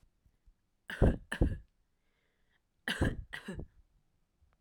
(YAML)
cough_length: 4.6 s
cough_amplitude: 6907
cough_signal_mean_std_ratio: 0.31
survey_phase: alpha (2021-03-01 to 2021-08-12)
age: 18-44
gender: Female
wearing_mask: 'No'
symptom_none: true
smoker_status: Never smoked
respiratory_condition_asthma: false
respiratory_condition_other: false
recruitment_source: REACT
submission_delay: 1 day
covid_test_result: Negative
covid_test_method: RT-qPCR